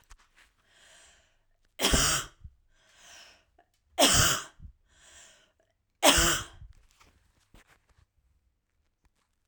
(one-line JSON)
{"three_cough_length": "9.5 s", "three_cough_amplitude": 19438, "three_cough_signal_mean_std_ratio": 0.3, "survey_phase": "beta (2021-08-13 to 2022-03-07)", "age": "18-44", "gender": "Female", "wearing_mask": "No", "symptom_runny_or_blocked_nose": true, "symptom_sore_throat": true, "symptom_onset": "13 days", "smoker_status": "Ex-smoker", "respiratory_condition_asthma": false, "respiratory_condition_other": false, "recruitment_source": "REACT", "submission_delay": "1 day", "covid_test_result": "Negative", "covid_test_method": "RT-qPCR", "influenza_a_test_result": "Negative", "influenza_b_test_result": "Negative"}